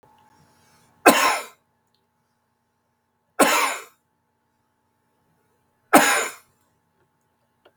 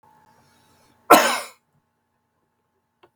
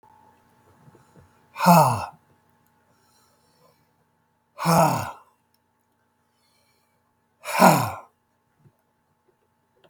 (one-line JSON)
{"three_cough_length": "7.8 s", "three_cough_amplitude": 32768, "three_cough_signal_mean_std_ratio": 0.27, "cough_length": "3.2 s", "cough_amplitude": 32768, "cough_signal_mean_std_ratio": 0.21, "exhalation_length": "9.9 s", "exhalation_amplitude": 30594, "exhalation_signal_mean_std_ratio": 0.27, "survey_phase": "beta (2021-08-13 to 2022-03-07)", "age": "65+", "gender": "Male", "wearing_mask": "No", "symptom_cough_any": true, "symptom_runny_or_blocked_nose": true, "smoker_status": "Never smoked", "respiratory_condition_asthma": true, "respiratory_condition_other": true, "recruitment_source": "REACT", "submission_delay": "1 day", "covid_test_result": "Negative", "covid_test_method": "RT-qPCR", "influenza_a_test_result": "Negative", "influenza_b_test_result": "Negative"}